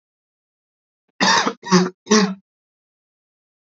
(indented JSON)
{
  "cough_length": "3.8 s",
  "cough_amplitude": 28239,
  "cough_signal_mean_std_ratio": 0.35,
  "survey_phase": "beta (2021-08-13 to 2022-03-07)",
  "age": "18-44",
  "gender": "Male",
  "wearing_mask": "No",
  "symptom_cough_any": true,
  "symptom_runny_or_blocked_nose": true,
  "symptom_onset": "9 days",
  "smoker_status": "Never smoked",
  "respiratory_condition_asthma": false,
  "respiratory_condition_other": false,
  "recruitment_source": "REACT",
  "submission_delay": "4 days",
  "covid_test_result": "Negative",
  "covid_test_method": "RT-qPCR",
  "influenza_a_test_result": "Negative",
  "influenza_b_test_result": "Negative"
}